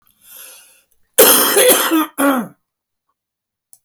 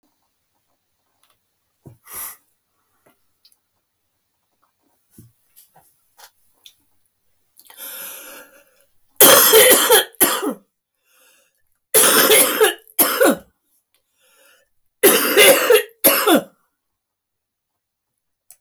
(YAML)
cough_length: 3.8 s
cough_amplitude: 32768
cough_signal_mean_std_ratio: 0.46
three_cough_length: 18.6 s
three_cough_amplitude: 32768
three_cough_signal_mean_std_ratio: 0.36
survey_phase: beta (2021-08-13 to 2022-03-07)
age: 65+
gender: Female
wearing_mask: 'No'
symptom_none: true
smoker_status: Ex-smoker
respiratory_condition_asthma: true
respiratory_condition_other: false
recruitment_source: REACT
submission_delay: 0 days
covid_test_result: Negative
covid_test_method: RT-qPCR
influenza_a_test_result: Negative
influenza_b_test_result: Negative